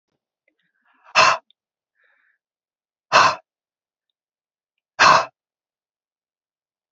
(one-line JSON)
{"exhalation_length": "6.9 s", "exhalation_amplitude": 32767, "exhalation_signal_mean_std_ratio": 0.24, "survey_phase": "beta (2021-08-13 to 2022-03-07)", "age": "18-44", "gender": "Female", "wearing_mask": "No", "symptom_none": true, "smoker_status": "Never smoked", "respiratory_condition_asthma": true, "respiratory_condition_other": false, "recruitment_source": "REACT", "submission_delay": "1 day", "covid_test_result": "Negative", "covid_test_method": "RT-qPCR"}